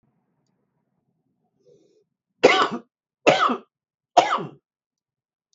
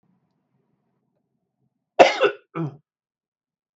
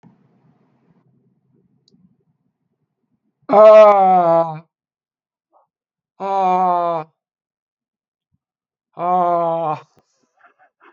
{
  "three_cough_length": "5.5 s",
  "three_cough_amplitude": 32766,
  "three_cough_signal_mean_std_ratio": 0.28,
  "cough_length": "3.8 s",
  "cough_amplitude": 32766,
  "cough_signal_mean_std_ratio": 0.21,
  "exhalation_length": "10.9 s",
  "exhalation_amplitude": 32768,
  "exhalation_signal_mean_std_ratio": 0.37,
  "survey_phase": "beta (2021-08-13 to 2022-03-07)",
  "age": "45-64",
  "gender": "Male",
  "wearing_mask": "No",
  "symptom_none": true,
  "smoker_status": "Current smoker (11 or more cigarettes per day)",
  "respiratory_condition_asthma": false,
  "respiratory_condition_other": false,
  "recruitment_source": "REACT",
  "submission_delay": "2 days",
  "covid_test_result": "Negative",
  "covid_test_method": "RT-qPCR",
  "influenza_a_test_result": "Negative",
  "influenza_b_test_result": "Negative"
}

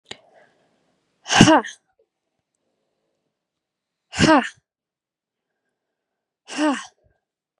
{
  "exhalation_length": "7.6 s",
  "exhalation_amplitude": 32768,
  "exhalation_signal_mean_std_ratio": 0.24,
  "survey_phase": "beta (2021-08-13 to 2022-03-07)",
  "age": "18-44",
  "gender": "Female",
  "wearing_mask": "No",
  "symptom_none": true,
  "smoker_status": "Never smoked",
  "respiratory_condition_asthma": false,
  "respiratory_condition_other": false,
  "recruitment_source": "REACT",
  "submission_delay": "2 days",
  "covid_test_result": "Negative",
  "covid_test_method": "RT-qPCR",
  "influenza_a_test_result": "Negative",
  "influenza_b_test_result": "Negative"
}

